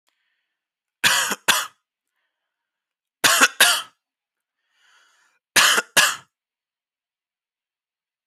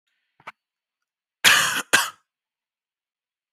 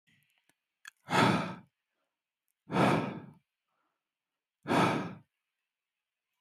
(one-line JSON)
{"three_cough_length": "8.3 s", "three_cough_amplitude": 27404, "three_cough_signal_mean_std_ratio": 0.31, "cough_length": "3.5 s", "cough_amplitude": 25912, "cough_signal_mean_std_ratio": 0.28, "exhalation_length": "6.4 s", "exhalation_amplitude": 7534, "exhalation_signal_mean_std_ratio": 0.35, "survey_phase": "alpha (2021-03-01 to 2021-08-12)", "age": "18-44", "gender": "Male", "wearing_mask": "No", "symptom_none": true, "smoker_status": "Ex-smoker", "respiratory_condition_asthma": false, "respiratory_condition_other": false, "recruitment_source": "REACT", "submission_delay": "1 day", "covid_test_result": "Negative", "covid_test_method": "RT-qPCR"}